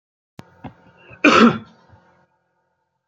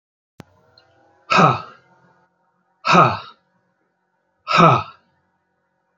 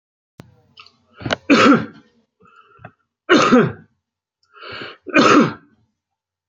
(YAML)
cough_length: 3.1 s
cough_amplitude: 28953
cough_signal_mean_std_ratio: 0.27
exhalation_length: 6.0 s
exhalation_amplitude: 30811
exhalation_signal_mean_std_ratio: 0.31
three_cough_length: 6.5 s
three_cough_amplitude: 29024
three_cough_signal_mean_std_ratio: 0.37
survey_phase: beta (2021-08-13 to 2022-03-07)
age: 45-64
gender: Male
wearing_mask: 'No'
symptom_none: true
smoker_status: Ex-smoker
respiratory_condition_asthma: false
respiratory_condition_other: false
recruitment_source: REACT
submission_delay: 5 days
covid_test_result: Negative
covid_test_method: RT-qPCR
influenza_a_test_result: Negative
influenza_b_test_result: Negative